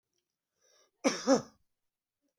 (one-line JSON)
{"cough_length": "2.4 s", "cough_amplitude": 7519, "cough_signal_mean_std_ratio": 0.25, "survey_phase": "beta (2021-08-13 to 2022-03-07)", "age": "65+", "gender": "Male", "wearing_mask": "No", "symptom_none": true, "smoker_status": "Ex-smoker", "respiratory_condition_asthma": false, "respiratory_condition_other": false, "recruitment_source": "REACT", "submission_delay": "4 days", "covid_test_result": "Negative", "covid_test_method": "RT-qPCR", "influenza_a_test_result": "Negative", "influenza_b_test_result": "Negative"}